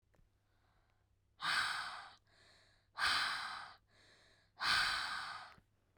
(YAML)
exhalation_length: 6.0 s
exhalation_amplitude: 2541
exhalation_signal_mean_std_ratio: 0.49
survey_phase: beta (2021-08-13 to 2022-03-07)
age: 18-44
gender: Female
wearing_mask: 'No'
symptom_none: true
smoker_status: Current smoker (1 to 10 cigarettes per day)
respiratory_condition_asthma: false
respiratory_condition_other: false
recruitment_source: REACT
submission_delay: 3 days
covid_test_result: Negative
covid_test_method: RT-qPCR
influenza_a_test_result: Negative
influenza_b_test_result: Negative